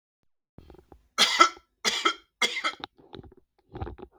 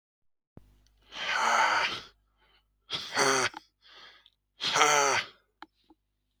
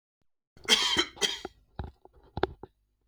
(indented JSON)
{
  "three_cough_length": "4.2 s",
  "three_cough_amplitude": 31250,
  "three_cough_signal_mean_std_ratio": 0.34,
  "exhalation_length": "6.4 s",
  "exhalation_amplitude": 19497,
  "exhalation_signal_mean_std_ratio": 0.45,
  "cough_length": "3.1 s",
  "cough_amplitude": 16270,
  "cough_signal_mean_std_ratio": 0.36,
  "survey_phase": "beta (2021-08-13 to 2022-03-07)",
  "age": "18-44",
  "gender": "Male",
  "wearing_mask": "No",
  "symptom_none": true,
  "smoker_status": "Never smoked",
  "respiratory_condition_asthma": false,
  "respiratory_condition_other": false,
  "recruitment_source": "REACT",
  "submission_delay": "1 day",
  "covid_test_result": "Negative",
  "covid_test_method": "RT-qPCR",
  "influenza_a_test_result": "Negative",
  "influenza_b_test_result": "Negative"
}